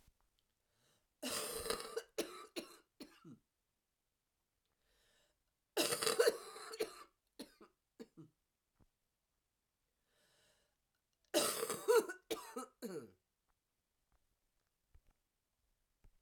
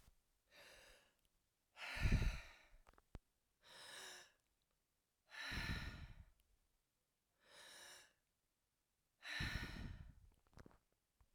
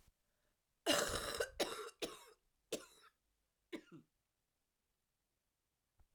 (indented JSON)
{
  "three_cough_length": "16.2 s",
  "three_cough_amplitude": 4906,
  "three_cough_signal_mean_std_ratio": 0.29,
  "exhalation_length": "11.3 s",
  "exhalation_amplitude": 1994,
  "exhalation_signal_mean_std_ratio": 0.35,
  "cough_length": "6.1 s",
  "cough_amplitude": 3272,
  "cough_signal_mean_std_ratio": 0.32,
  "survey_phase": "alpha (2021-03-01 to 2021-08-12)",
  "age": "45-64",
  "gender": "Female",
  "wearing_mask": "No",
  "symptom_cough_any": true,
  "symptom_headache": true,
  "symptom_change_to_sense_of_smell_or_taste": true,
  "symptom_onset": "3 days",
  "smoker_status": "Ex-smoker",
  "respiratory_condition_asthma": false,
  "respiratory_condition_other": false,
  "recruitment_source": "Test and Trace",
  "submission_delay": "2 days",
  "covid_test_result": "Positive",
  "covid_test_method": "RT-qPCR",
  "covid_ct_value": 15.7,
  "covid_ct_gene": "N gene"
}